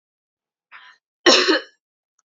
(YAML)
cough_length: 2.3 s
cough_amplitude: 30401
cough_signal_mean_std_ratio: 0.3
survey_phase: alpha (2021-03-01 to 2021-08-12)
age: 45-64
gender: Female
wearing_mask: 'No'
symptom_none: true
smoker_status: Current smoker (1 to 10 cigarettes per day)
respiratory_condition_asthma: true
respiratory_condition_other: false
recruitment_source: REACT
submission_delay: 2 days
covid_test_result: Negative
covid_test_method: RT-qPCR